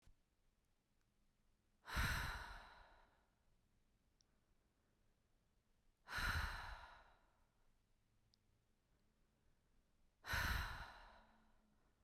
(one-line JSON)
{"exhalation_length": "12.0 s", "exhalation_amplitude": 1118, "exhalation_signal_mean_std_ratio": 0.36, "survey_phase": "beta (2021-08-13 to 2022-03-07)", "age": "18-44", "gender": "Female", "wearing_mask": "No", "symptom_none": true, "smoker_status": "Never smoked", "respiratory_condition_asthma": false, "respiratory_condition_other": false, "recruitment_source": "REACT", "submission_delay": "1 day", "covid_test_result": "Negative", "covid_test_method": "RT-qPCR"}